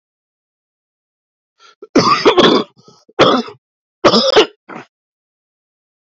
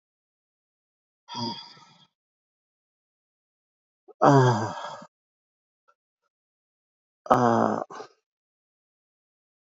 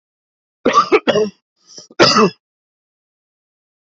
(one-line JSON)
{"three_cough_length": "6.1 s", "three_cough_amplitude": 32312, "three_cough_signal_mean_std_ratio": 0.38, "exhalation_length": "9.6 s", "exhalation_amplitude": 26110, "exhalation_signal_mean_std_ratio": 0.26, "cough_length": "3.9 s", "cough_amplitude": 28995, "cough_signal_mean_std_ratio": 0.36, "survey_phase": "beta (2021-08-13 to 2022-03-07)", "age": "45-64", "gender": "Male", "wearing_mask": "No", "symptom_new_continuous_cough": true, "symptom_sore_throat": true, "symptom_fatigue": true, "symptom_fever_high_temperature": true, "symptom_loss_of_taste": true, "smoker_status": "Ex-smoker", "respiratory_condition_asthma": false, "respiratory_condition_other": false, "recruitment_source": "Test and Trace", "submission_delay": "2 days", "covid_test_result": "Positive", "covid_test_method": "LAMP"}